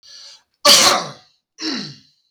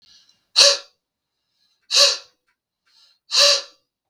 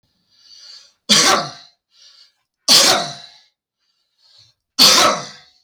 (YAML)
cough_length: 2.3 s
cough_amplitude: 32768
cough_signal_mean_std_ratio: 0.38
exhalation_length: 4.1 s
exhalation_amplitude: 32766
exhalation_signal_mean_std_ratio: 0.33
three_cough_length: 5.6 s
three_cough_amplitude: 32766
three_cough_signal_mean_std_ratio: 0.37
survey_phase: beta (2021-08-13 to 2022-03-07)
age: 18-44
gender: Male
wearing_mask: 'No'
symptom_cough_any: true
symptom_fatigue: true
symptom_onset: 8 days
smoker_status: Never smoked
respiratory_condition_asthma: false
respiratory_condition_other: false
recruitment_source: Test and Trace
submission_delay: 1 day
covid_test_result: Negative
covid_test_method: RT-qPCR